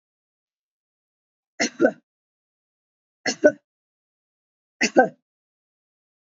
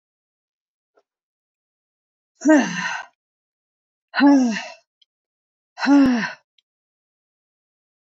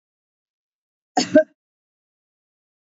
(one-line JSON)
{"three_cough_length": "6.4 s", "three_cough_amplitude": 27070, "three_cough_signal_mean_std_ratio": 0.2, "exhalation_length": "8.0 s", "exhalation_amplitude": 20953, "exhalation_signal_mean_std_ratio": 0.34, "cough_length": "3.0 s", "cough_amplitude": 26910, "cough_signal_mean_std_ratio": 0.18, "survey_phase": "beta (2021-08-13 to 2022-03-07)", "age": "45-64", "gender": "Female", "wearing_mask": "No", "symptom_none": true, "smoker_status": "Never smoked", "respiratory_condition_asthma": false, "respiratory_condition_other": false, "recruitment_source": "REACT", "submission_delay": "3 days", "covid_test_result": "Negative", "covid_test_method": "RT-qPCR"}